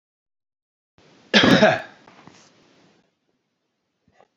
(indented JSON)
{
  "cough_length": "4.4 s",
  "cough_amplitude": 28412,
  "cough_signal_mean_std_ratio": 0.26,
  "survey_phase": "beta (2021-08-13 to 2022-03-07)",
  "age": "45-64",
  "gender": "Male",
  "wearing_mask": "No",
  "symptom_none": true,
  "smoker_status": "Current smoker (1 to 10 cigarettes per day)",
  "respiratory_condition_asthma": false,
  "respiratory_condition_other": false,
  "recruitment_source": "REACT",
  "submission_delay": "6 days",
  "covid_test_result": "Negative",
  "covid_test_method": "RT-qPCR"
}